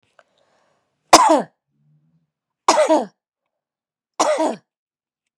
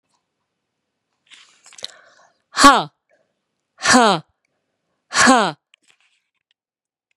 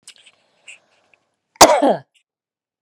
{
  "three_cough_length": "5.4 s",
  "three_cough_amplitude": 32768,
  "three_cough_signal_mean_std_ratio": 0.32,
  "exhalation_length": "7.2 s",
  "exhalation_amplitude": 32768,
  "exhalation_signal_mean_std_ratio": 0.26,
  "cough_length": "2.8 s",
  "cough_amplitude": 32768,
  "cough_signal_mean_std_ratio": 0.26,
  "survey_phase": "beta (2021-08-13 to 2022-03-07)",
  "age": "65+",
  "gender": "Female",
  "wearing_mask": "No",
  "symptom_cough_any": true,
  "symptom_runny_or_blocked_nose": true,
  "symptom_shortness_of_breath": true,
  "symptom_fatigue": true,
  "symptom_headache": true,
  "symptom_loss_of_taste": true,
  "symptom_other": true,
  "symptom_onset": "3 days",
  "smoker_status": "Ex-smoker",
  "respiratory_condition_asthma": true,
  "respiratory_condition_other": false,
  "recruitment_source": "Test and Trace",
  "submission_delay": "2 days",
  "covid_test_result": "Negative",
  "covid_test_method": "RT-qPCR"
}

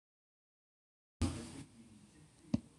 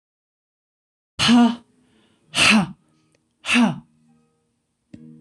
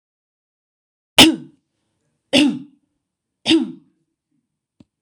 {
  "cough_length": "2.8 s",
  "cough_amplitude": 3739,
  "cough_signal_mean_std_ratio": 0.28,
  "exhalation_length": "5.2 s",
  "exhalation_amplitude": 24092,
  "exhalation_signal_mean_std_ratio": 0.36,
  "three_cough_length": "5.0 s",
  "three_cough_amplitude": 26028,
  "three_cough_signal_mean_std_ratio": 0.27,
  "survey_phase": "alpha (2021-03-01 to 2021-08-12)",
  "age": "65+",
  "gender": "Female",
  "wearing_mask": "No",
  "symptom_none": true,
  "smoker_status": "Never smoked",
  "respiratory_condition_asthma": false,
  "respiratory_condition_other": false,
  "recruitment_source": "REACT",
  "submission_delay": "5 days",
  "covid_test_result": "Negative",
  "covid_test_method": "RT-qPCR"
}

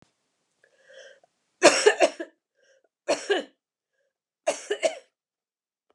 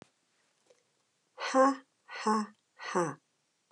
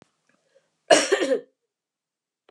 {
  "three_cough_length": "5.9 s",
  "three_cough_amplitude": 29945,
  "three_cough_signal_mean_std_ratio": 0.28,
  "exhalation_length": "3.7 s",
  "exhalation_amplitude": 6641,
  "exhalation_signal_mean_std_ratio": 0.36,
  "cough_length": "2.5 s",
  "cough_amplitude": 25961,
  "cough_signal_mean_std_ratio": 0.3,
  "survey_phase": "alpha (2021-03-01 to 2021-08-12)",
  "age": "65+",
  "gender": "Female",
  "wearing_mask": "No",
  "symptom_cough_any": true,
  "symptom_new_continuous_cough": true,
  "symptom_shortness_of_breath": true,
  "symptom_fatigue": true,
  "symptom_change_to_sense_of_smell_or_taste": true,
  "symptom_onset": "3 days",
  "smoker_status": "Never smoked",
  "respiratory_condition_asthma": false,
  "respiratory_condition_other": false,
  "recruitment_source": "Test and Trace",
  "submission_delay": "2 days",
  "covid_test_result": "Positive",
  "covid_test_method": "RT-qPCR"
}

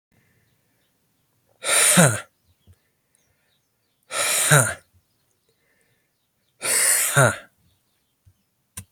{
  "exhalation_length": "8.9 s",
  "exhalation_amplitude": 30649,
  "exhalation_signal_mean_std_ratio": 0.35,
  "survey_phase": "beta (2021-08-13 to 2022-03-07)",
  "age": "45-64",
  "gender": "Male",
  "wearing_mask": "No",
  "symptom_cough_any": true,
  "symptom_new_continuous_cough": true,
  "symptom_runny_or_blocked_nose": true,
  "symptom_sore_throat": true,
  "symptom_fatigue": true,
  "symptom_fever_high_temperature": true,
  "symptom_onset": "2 days",
  "smoker_status": "Never smoked",
  "respiratory_condition_asthma": false,
  "respiratory_condition_other": false,
  "recruitment_source": "Test and Trace",
  "submission_delay": "1 day",
  "covid_test_result": "Positive",
  "covid_test_method": "RT-qPCR",
  "covid_ct_value": 15.4,
  "covid_ct_gene": "ORF1ab gene",
  "covid_ct_mean": 15.5,
  "covid_viral_load": "8100000 copies/ml",
  "covid_viral_load_category": "High viral load (>1M copies/ml)"
}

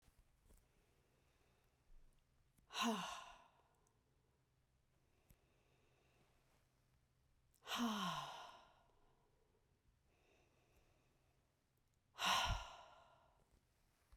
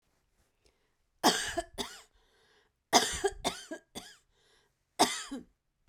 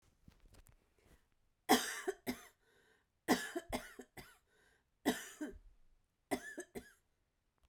{
  "exhalation_length": "14.2 s",
  "exhalation_amplitude": 1447,
  "exhalation_signal_mean_std_ratio": 0.31,
  "cough_length": "5.9 s",
  "cough_amplitude": 14142,
  "cough_signal_mean_std_ratio": 0.32,
  "three_cough_length": "7.7 s",
  "three_cough_amplitude": 6461,
  "three_cough_signal_mean_std_ratio": 0.3,
  "survey_phase": "beta (2021-08-13 to 2022-03-07)",
  "age": "45-64",
  "gender": "Female",
  "wearing_mask": "No",
  "symptom_none": true,
  "smoker_status": "Never smoked",
  "respiratory_condition_asthma": true,
  "respiratory_condition_other": false,
  "recruitment_source": "REACT",
  "submission_delay": "2 days",
  "covid_test_result": "Negative",
  "covid_test_method": "RT-qPCR"
}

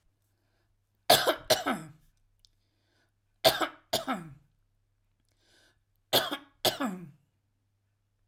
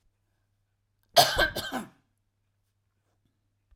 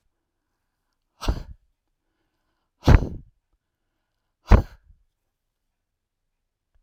{
  "three_cough_length": "8.3 s",
  "three_cough_amplitude": 19374,
  "three_cough_signal_mean_std_ratio": 0.29,
  "cough_length": "3.8 s",
  "cough_amplitude": 18178,
  "cough_signal_mean_std_ratio": 0.25,
  "exhalation_length": "6.8 s",
  "exhalation_amplitude": 32768,
  "exhalation_signal_mean_std_ratio": 0.17,
  "survey_phase": "alpha (2021-03-01 to 2021-08-12)",
  "age": "65+",
  "gender": "Male",
  "wearing_mask": "No",
  "symptom_none": true,
  "smoker_status": "Never smoked",
  "respiratory_condition_asthma": false,
  "respiratory_condition_other": false,
  "recruitment_source": "REACT",
  "submission_delay": "3 days",
  "covid_test_result": "Negative",
  "covid_test_method": "RT-qPCR"
}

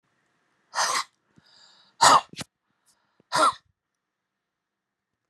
{
  "exhalation_length": "5.3 s",
  "exhalation_amplitude": 23259,
  "exhalation_signal_mean_std_ratio": 0.26,
  "survey_phase": "beta (2021-08-13 to 2022-03-07)",
  "age": "65+",
  "gender": "Male",
  "wearing_mask": "No",
  "symptom_none": true,
  "smoker_status": "Never smoked",
  "respiratory_condition_asthma": false,
  "respiratory_condition_other": false,
  "recruitment_source": "REACT",
  "submission_delay": "3 days",
  "covid_test_result": "Negative",
  "covid_test_method": "RT-qPCR"
}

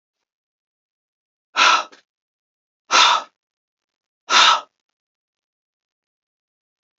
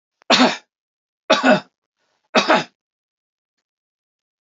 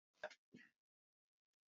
{
  "exhalation_length": "7.0 s",
  "exhalation_amplitude": 29793,
  "exhalation_signal_mean_std_ratio": 0.28,
  "three_cough_length": "4.4 s",
  "three_cough_amplitude": 30421,
  "three_cough_signal_mean_std_ratio": 0.32,
  "cough_length": "1.7 s",
  "cough_amplitude": 553,
  "cough_signal_mean_std_ratio": 0.2,
  "survey_phase": "alpha (2021-03-01 to 2021-08-12)",
  "age": "65+",
  "gender": "Male",
  "wearing_mask": "No",
  "symptom_none": true,
  "smoker_status": "Never smoked",
  "respiratory_condition_asthma": false,
  "respiratory_condition_other": false,
  "recruitment_source": "REACT",
  "submission_delay": "2 days",
  "covid_test_result": "Negative",
  "covid_test_method": "RT-qPCR"
}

